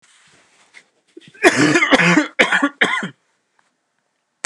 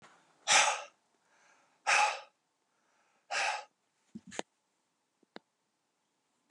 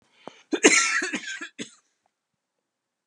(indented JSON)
{
  "three_cough_length": "4.5 s",
  "three_cough_amplitude": 32768,
  "three_cough_signal_mean_std_ratio": 0.43,
  "exhalation_length": "6.5 s",
  "exhalation_amplitude": 8105,
  "exhalation_signal_mean_std_ratio": 0.29,
  "cough_length": "3.1 s",
  "cough_amplitude": 30732,
  "cough_signal_mean_std_ratio": 0.34,
  "survey_phase": "beta (2021-08-13 to 2022-03-07)",
  "age": "45-64",
  "gender": "Male",
  "wearing_mask": "No",
  "symptom_cough_any": true,
  "symptom_runny_or_blocked_nose": true,
  "symptom_shortness_of_breath": true,
  "symptom_sore_throat": true,
  "symptom_onset": "2 days",
  "smoker_status": "Never smoked",
  "respiratory_condition_asthma": true,
  "respiratory_condition_other": false,
  "recruitment_source": "Test and Trace",
  "submission_delay": "1 day",
  "covid_test_result": "Positive",
  "covid_test_method": "RT-qPCR",
  "covid_ct_value": 17.8,
  "covid_ct_gene": "ORF1ab gene",
  "covid_ct_mean": 18.3,
  "covid_viral_load": "1000000 copies/ml",
  "covid_viral_load_category": "High viral load (>1M copies/ml)"
}